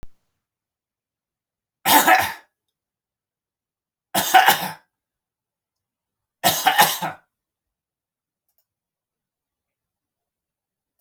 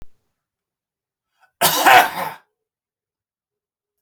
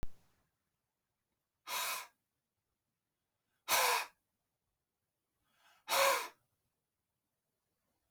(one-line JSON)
{"three_cough_length": "11.0 s", "three_cough_amplitude": 31870, "three_cough_signal_mean_std_ratio": 0.27, "cough_length": "4.0 s", "cough_amplitude": 31635, "cough_signal_mean_std_ratio": 0.28, "exhalation_length": "8.1 s", "exhalation_amplitude": 4201, "exhalation_signal_mean_std_ratio": 0.29, "survey_phase": "beta (2021-08-13 to 2022-03-07)", "age": "45-64", "gender": "Male", "wearing_mask": "No", "symptom_none": true, "smoker_status": "Never smoked", "respiratory_condition_asthma": false, "respiratory_condition_other": false, "recruitment_source": "REACT", "submission_delay": "1 day", "covid_test_result": "Negative", "covid_test_method": "RT-qPCR"}